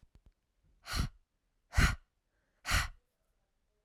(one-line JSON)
{"exhalation_length": "3.8 s", "exhalation_amplitude": 6131, "exhalation_signal_mean_std_ratio": 0.3, "survey_phase": "alpha (2021-03-01 to 2021-08-12)", "age": "18-44", "gender": "Female", "wearing_mask": "No", "symptom_none": true, "smoker_status": "Never smoked", "respiratory_condition_asthma": true, "respiratory_condition_other": false, "recruitment_source": "REACT", "submission_delay": "1 day", "covid_test_result": "Negative", "covid_test_method": "RT-qPCR"}